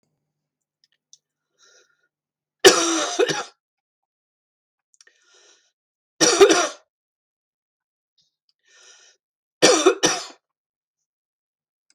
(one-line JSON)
{"three_cough_length": "11.9 s", "three_cough_amplitude": 32768, "three_cough_signal_mean_std_ratio": 0.27, "survey_phase": "beta (2021-08-13 to 2022-03-07)", "age": "65+", "gender": "Female", "wearing_mask": "No", "symptom_cough_any": true, "smoker_status": "Ex-smoker", "respiratory_condition_asthma": false, "respiratory_condition_other": false, "recruitment_source": "REACT", "submission_delay": "2 days", "covid_test_result": "Negative", "covid_test_method": "RT-qPCR"}